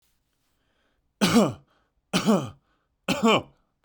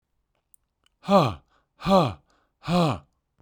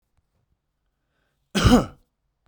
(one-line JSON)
{"three_cough_length": "3.8 s", "three_cough_amplitude": 14172, "three_cough_signal_mean_std_ratio": 0.38, "exhalation_length": "3.4 s", "exhalation_amplitude": 16637, "exhalation_signal_mean_std_ratio": 0.38, "cough_length": "2.5 s", "cough_amplitude": 22804, "cough_signal_mean_std_ratio": 0.27, "survey_phase": "beta (2021-08-13 to 2022-03-07)", "age": "18-44", "gender": "Male", "wearing_mask": "No", "symptom_none": true, "smoker_status": "Never smoked", "respiratory_condition_asthma": false, "respiratory_condition_other": false, "recruitment_source": "REACT", "submission_delay": "2 days", "covid_test_result": "Negative", "covid_test_method": "RT-qPCR"}